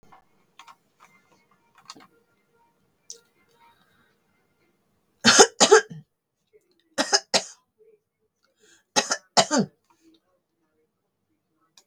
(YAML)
three_cough_length: 11.9 s
three_cough_amplitude: 32768
three_cough_signal_mean_std_ratio: 0.21
survey_phase: beta (2021-08-13 to 2022-03-07)
age: 65+
gender: Female
wearing_mask: 'No'
symptom_none: true
smoker_status: Never smoked
respiratory_condition_asthma: false
respiratory_condition_other: false
recruitment_source: REACT
submission_delay: 4 days
covid_test_result: Negative
covid_test_method: RT-qPCR
influenza_a_test_result: Negative
influenza_b_test_result: Negative